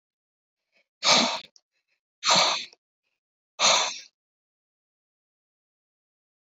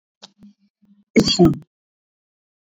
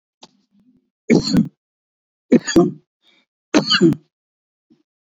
{"exhalation_length": "6.5 s", "exhalation_amplitude": 20989, "exhalation_signal_mean_std_ratio": 0.31, "cough_length": "2.6 s", "cough_amplitude": 26989, "cough_signal_mean_std_ratio": 0.29, "three_cough_length": "5.0 s", "three_cough_amplitude": 27675, "three_cough_signal_mean_std_ratio": 0.34, "survey_phase": "beta (2021-08-13 to 2022-03-07)", "age": "65+", "gender": "Male", "wearing_mask": "No", "symptom_none": true, "smoker_status": "Never smoked", "respiratory_condition_asthma": false, "respiratory_condition_other": false, "recruitment_source": "REACT", "submission_delay": "2 days", "covid_test_result": "Negative", "covid_test_method": "RT-qPCR", "influenza_a_test_result": "Negative", "influenza_b_test_result": "Negative"}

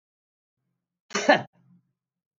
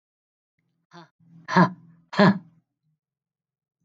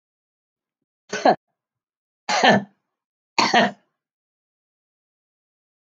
{"cough_length": "2.4 s", "cough_amplitude": 21421, "cough_signal_mean_std_ratio": 0.21, "exhalation_length": "3.8 s", "exhalation_amplitude": 25050, "exhalation_signal_mean_std_ratio": 0.25, "three_cough_length": "5.9 s", "three_cough_amplitude": 30643, "three_cough_signal_mean_std_ratio": 0.28, "survey_phase": "beta (2021-08-13 to 2022-03-07)", "age": "45-64", "gender": "Female", "wearing_mask": "No", "symptom_none": true, "smoker_status": "Never smoked", "respiratory_condition_asthma": false, "respiratory_condition_other": false, "recruitment_source": "REACT", "submission_delay": "1 day", "covid_test_result": "Negative", "covid_test_method": "RT-qPCR", "influenza_a_test_result": "Unknown/Void", "influenza_b_test_result": "Unknown/Void"}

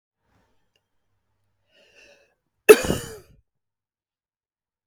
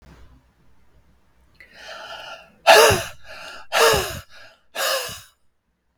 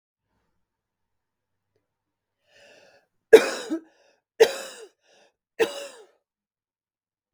{"cough_length": "4.9 s", "cough_amplitude": 32768, "cough_signal_mean_std_ratio": 0.13, "exhalation_length": "6.0 s", "exhalation_amplitude": 32768, "exhalation_signal_mean_std_ratio": 0.35, "three_cough_length": "7.3 s", "three_cough_amplitude": 32768, "three_cough_signal_mean_std_ratio": 0.17, "survey_phase": "beta (2021-08-13 to 2022-03-07)", "age": "45-64", "gender": "Female", "wearing_mask": "No", "symptom_none": true, "symptom_onset": "6 days", "smoker_status": "Prefer not to say", "respiratory_condition_asthma": false, "respiratory_condition_other": false, "recruitment_source": "REACT", "submission_delay": "1 day", "covid_test_result": "Negative", "covid_test_method": "RT-qPCR", "influenza_a_test_result": "Negative", "influenza_b_test_result": "Negative"}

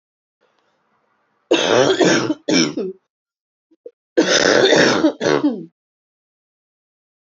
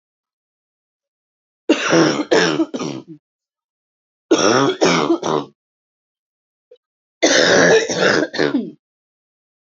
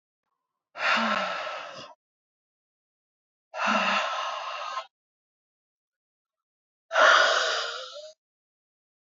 {"cough_length": "7.3 s", "cough_amplitude": 29571, "cough_signal_mean_std_ratio": 0.48, "three_cough_length": "9.7 s", "three_cough_amplitude": 32768, "three_cough_signal_mean_std_ratio": 0.47, "exhalation_length": "9.1 s", "exhalation_amplitude": 16680, "exhalation_signal_mean_std_ratio": 0.42, "survey_phase": "alpha (2021-03-01 to 2021-08-12)", "age": "18-44", "gender": "Female", "wearing_mask": "No", "symptom_cough_any": true, "symptom_new_continuous_cough": true, "symptom_shortness_of_breath": true, "symptom_fatigue": true, "symptom_headache": true, "symptom_change_to_sense_of_smell_or_taste": true, "symptom_loss_of_taste": true, "symptom_onset": "3 days", "smoker_status": "Current smoker (1 to 10 cigarettes per day)", "respiratory_condition_asthma": true, "respiratory_condition_other": false, "recruitment_source": "Test and Trace", "submission_delay": "2 days", "covid_test_result": "Positive", "covid_test_method": "RT-qPCR"}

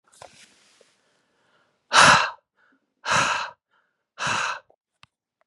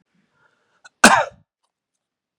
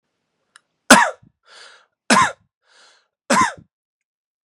{"exhalation_length": "5.5 s", "exhalation_amplitude": 31004, "exhalation_signal_mean_std_ratio": 0.32, "cough_length": "2.4 s", "cough_amplitude": 32768, "cough_signal_mean_std_ratio": 0.21, "three_cough_length": "4.4 s", "three_cough_amplitude": 32768, "three_cough_signal_mean_std_ratio": 0.28, "survey_phase": "beta (2021-08-13 to 2022-03-07)", "age": "18-44", "gender": "Male", "wearing_mask": "No", "symptom_diarrhoea": true, "symptom_fatigue": true, "symptom_onset": "12 days", "smoker_status": "Never smoked", "respiratory_condition_asthma": false, "respiratory_condition_other": false, "recruitment_source": "REACT", "submission_delay": "3 days", "covid_test_result": "Negative", "covid_test_method": "RT-qPCR", "influenza_a_test_result": "Negative", "influenza_b_test_result": "Negative"}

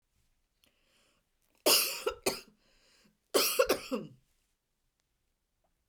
{"three_cough_length": "5.9 s", "three_cough_amplitude": 9321, "three_cough_signal_mean_std_ratio": 0.31, "survey_phase": "beta (2021-08-13 to 2022-03-07)", "age": "45-64", "gender": "Female", "wearing_mask": "Yes", "symptom_none": true, "smoker_status": "Never smoked", "respiratory_condition_asthma": true, "respiratory_condition_other": false, "recruitment_source": "REACT", "submission_delay": "8 days", "covid_test_result": "Negative", "covid_test_method": "RT-qPCR"}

